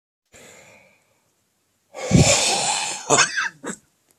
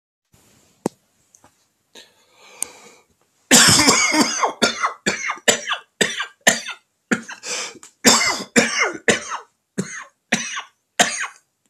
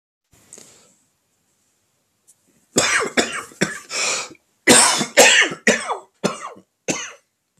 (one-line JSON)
{"exhalation_length": "4.2 s", "exhalation_amplitude": 26040, "exhalation_signal_mean_std_ratio": 0.44, "cough_length": "11.7 s", "cough_amplitude": 32768, "cough_signal_mean_std_ratio": 0.43, "three_cough_length": "7.6 s", "three_cough_amplitude": 32768, "three_cough_signal_mean_std_ratio": 0.4, "survey_phase": "beta (2021-08-13 to 2022-03-07)", "age": "45-64", "gender": "Male", "wearing_mask": "No", "symptom_cough_any": true, "symptom_onset": "12 days", "smoker_status": "Ex-smoker", "respiratory_condition_asthma": false, "respiratory_condition_other": false, "recruitment_source": "REACT", "submission_delay": "1 day", "covid_test_result": "Negative", "covid_test_method": "RT-qPCR", "influenza_a_test_result": "Negative", "influenza_b_test_result": "Negative"}